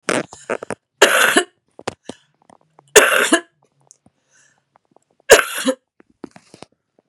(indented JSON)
{
  "three_cough_length": "7.1 s",
  "three_cough_amplitude": 32768,
  "three_cough_signal_mean_std_ratio": 0.31,
  "survey_phase": "beta (2021-08-13 to 2022-03-07)",
  "age": "45-64",
  "gender": "Female",
  "wearing_mask": "No",
  "symptom_cough_any": true,
  "symptom_runny_or_blocked_nose": true,
  "symptom_sore_throat": true,
  "symptom_fatigue": true,
  "symptom_onset": "4 days",
  "smoker_status": "Never smoked",
  "respiratory_condition_asthma": false,
  "respiratory_condition_other": false,
  "recruitment_source": "Test and Trace",
  "submission_delay": "2 days",
  "covid_test_result": "Positive",
  "covid_test_method": "RT-qPCR",
  "covid_ct_value": 14.9,
  "covid_ct_gene": "ORF1ab gene"
}